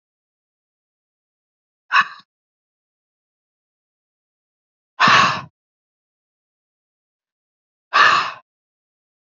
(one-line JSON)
{"exhalation_length": "9.4 s", "exhalation_amplitude": 28349, "exhalation_signal_mean_std_ratio": 0.24, "survey_phase": "beta (2021-08-13 to 2022-03-07)", "age": "18-44", "gender": "Female", "wearing_mask": "No", "symptom_cough_any": true, "symptom_runny_or_blocked_nose": true, "symptom_fatigue": true, "symptom_headache": true, "symptom_other": true, "smoker_status": "Never smoked", "respiratory_condition_asthma": false, "respiratory_condition_other": false, "recruitment_source": "Test and Trace", "submission_delay": "1 day", "covid_test_result": "Positive", "covid_test_method": "RT-qPCR", "covid_ct_value": 20.5, "covid_ct_gene": "ORF1ab gene"}